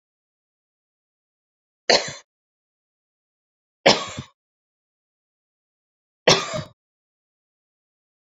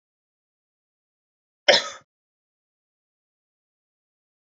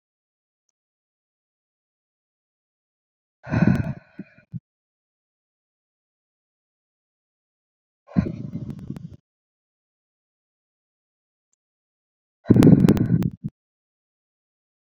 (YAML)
three_cough_length: 8.4 s
three_cough_amplitude: 28525
three_cough_signal_mean_std_ratio: 0.19
cough_length: 4.4 s
cough_amplitude: 30487
cough_signal_mean_std_ratio: 0.14
exhalation_length: 14.9 s
exhalation_amplitude: 27373
exhalation_signal_mean_std_ratio: 0.22
survey_phase: beta (2021-08-13 to 2022-03-07)
age: 18-44
gender: Female
wearing_mask: 'No'
symptom_none: true
smoker_status: Never smoked
respiratory_condition_asthma: false
respiratory_condition_other: false
recruitment_source: REACT
submission_delay: 2 days
covid_test_result: Negative
covid_test_method: RT-qPCR